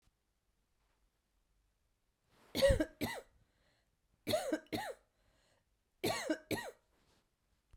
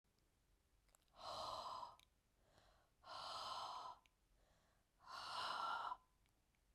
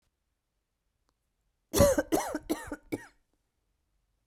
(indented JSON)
{
  "three_cough_length": "7.8 s",
  "three_cough_amplitude": 4554,
  "three_cough_signal_mean_std_ratio": 0.32,
  "exhalation_length": "6.7 s",
  "exhalation_amplitude": 699,
  "exhalation_signal_mean_std_ratio": 0.56,
  "cough_length": "4.3 s",
  "cough_amplitude": 12838,
  "cough_signal_mean_std_ratio": 0.3,
  "survey_phase": "beta (2021-08-13 to 2022-03-07)",
  "age": "18-44",
  "gender": "Female",
  "wearing_mask": "No",
  "symptom_none": true,
  "smoker_status": "Never smoked",
  "respiratory_condition_asthma": false,
  "respiratory_condition_other": false,
  "recruitment_source": "REACT",
  "submission_delay": "2 days",
  "covid_test_result": "Negative",
  "covid_test_method": "RT-qPCR"
}